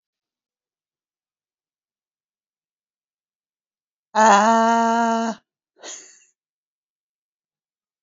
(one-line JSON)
{"exhalation_length": "8.0 s", "exhalation_amplitude": 26179, "exhalation_signal_mean_std_ratio": 0.29, "survey_phase": "beta (2021-08-13 to 2022-03-07)", "age": "45-64", "gender": "Female", "wearing_mask": "No", "symptom_none": true, "smoker_status": "Current smoker (e-cigarettes or vapes only)", "respiratory_condition_asthma": false, "respiratory_condition_other": false, "recruitment_source": "REACT", "submission_delay": "3 days", "covid_test_result": "Negative", "covid_test_method": "RT-qPCR", "influenza_a_test_result": "Negative", "influenza_b_test_result": "Negative"}